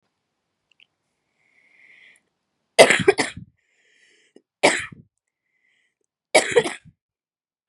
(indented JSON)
{
  "three_cough_length": "7.7 s",
  "three_cough_amplitude": 32768,
  "three_cough_signal_mean_std_ratio": 0.22,
  "survey_phase": "beta (2021-08-13 to 2022-03-07)",
  "age": "18-44",
  "gender": "Female",
  "wearing_mask": "No",
  "symptom_none": true,
  "smoker_status": "Never smoked",
  "respiratory_condition_asthma": true,
  "respiratory_condition_other": false,
  "recruitment_source": "REACT",
  "submission_delay": "2 days",
  "covid_test_result": "Negative",
  "covid_test_method": "RT-qPCR",
  "influenza_a_test_result": "Negative",
  "influenza_b_test_result": "Negative"
}